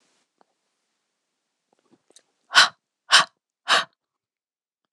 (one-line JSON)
{"exhalation_length": "4.9 s", "exhalation_amplitude": 26027, "exhalation_signal_mean_std_ratio": 0.21, "survey_phase": "beta (2021-08-13 to 2022-03-07)", "age": "45-64", "gender": "Female", "wearing_mask": "No", "symptom_cough_any": true, "symptom_sore_throat": true, "symptom_onset": "3 days", "smoker_status": "Never smoked", "respiratory_condition_asthma": false, "respiratory_condition_other": false, "recruitment_source": "Test and Trace", "submission_delay": "2 days", "covid_test_result": "Positive", "covid_test_method": "RT-qPCR"}